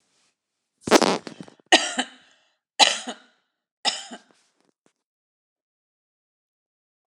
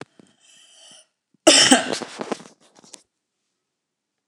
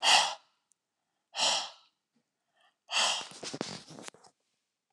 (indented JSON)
{
  "three_cough_length": "7.2 s",
  "three_cough_amplitude": 29204,
  "three_cough_signal_mean_std_ratio": 0.23,
  "cough_length": "4.3 s",
  "cough_amplitude": 29204,
  "cough_signal_mean_std_ratio": 0.27,
  "exhalation_length": "4.9 s",
  "exhalation_amplitude": 10379,
  "exhalation_signal_mean_std_ratio": 0.37,
  "survey_phase": "beta (2021-08-13 to 2022-03-07)",
  "age": "65+",
  "gender": "Female",
  "wearing_mask": "No",
  "symptom_none": true,
  "smoker_status": "Never smoked",
  "respiratory_condition_asthma": false,
  "respiratory_condition_other": false,
  "recruitment_source": "REACT",
  "submission_delay": "1 day",
  "covid_test_result": "Negative",
  "covid_test_method": "RT-qPCR"
}